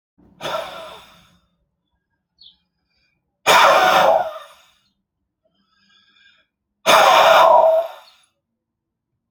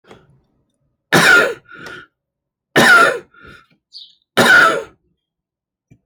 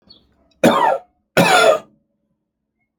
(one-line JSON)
{"exhalation_length": "9.3 s", "exhalation_amplitude": 32767, "exhalation_signal_mean_std_ratio": 0.39, "three_cough_length": "6.1 s", "three_cough_amplitude": 31110, "three_cough_signal_mean_std_ratio": 0.4, "cough_length": "3.0 s", "cough_amplitude": 32768, "cough_signal_mean_std_ratio": 0.43, "survey_phase": "alpha (2021-03-01 to 2021-08-12)", "age": "45-64", "gender": "Male", "wearing_mask": "No", "symptom_none": true, "smoker_status": "Never smoked", "respiratory_condition_asthma": true, "respiratory_condition_other": false, "recruitment_source": "REACT", "submission_delay": "5 days", "covid_test_result": "Negative", "covid_test_method": "RT-qPCR"}